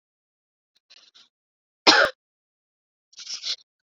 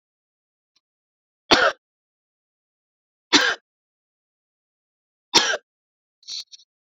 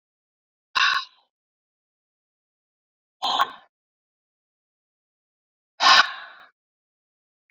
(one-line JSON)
{"cough_length": "3.8 s", "cough_amplitude": 32476, "cough_signal_mean_std_ratio": 0.22, "three_cough_length": "6.8 s", "three_cough_amplitude": 32767, "three_cough_signal_mean_std_ratio": 0.23, "exhalation_length": "7.5 s", "exhalation_amplitude": 24546, "exhalation_signal_mean_std_ratio": 0.24, "survey_phase": "beta (2021-08-13 to 2022-03-07)", "age": "45-64", "gender": "Female", "wearing_mask": "No", "symptom_none": true, "symptom_onset": "9 days", "smoker_status": "Never smoked", "respiratory_condition_asthma": false, "respiratory_condition_other": false, "recruitment_source": "REACT", "submission_delay": "5 days", "covid_test_result": "Negative", "covid_test_method": "RT-qPCR", "influenza_a_test_result": "Negative", "influenza_b_test_result": "Negative"}